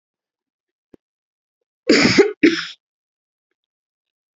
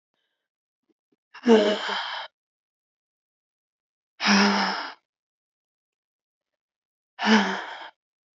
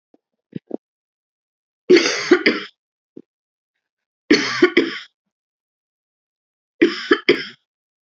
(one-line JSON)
{"cough_length": "4.4 s", "cough_amplitude": 28109, "cough_signal_mean_std_ratio": 0.28, "exhalation_length": "8.4 s", "exhalation_amplitude": 21607, "exhalation_signal_mean_std_ratio": 0.34, "three_cough_length": "8.0 s", "three_cough_amplitude": 32768, "three_cough_signal_mean_std_ratio": 0.31, "survey_phase": "alpha (2021-03-01 to 2021-08-12)", "age": "18-44", "gender": "Female", "wearing_mask": "No", "symptom_cough_any": true, "symptom_new_continuous_cough": true, "symptom_shortness_of_breath": true, "symptom_abdominal_pain": true, "symptom_fatigue": true, "symptom_fever_high_temperature": true, "symptom_headache": true, "symptom_change_to_sense_of_smell_or_taste": true, "symptom_loss_of_taste": true, "symptom_onset": "5 days", "smoker_status": "Ex-smoker", "respiratory_condition_asthma": false, "respiratory_condition_other": false, "recruitment_source": "Test and Trace", "submission_delay": "1 day", "covid_test_result": "Positive", "covid_test_method": "RT-qPCR", "covid_ct_value": 15.7, "covid_ct_gene": "ORF1ab gene", "covid_ct_mean": 15.9, "covid_viral_load": "6000000 copies/ml", "covid_viral_load_category": "High viral load (>1M copies/ml)"}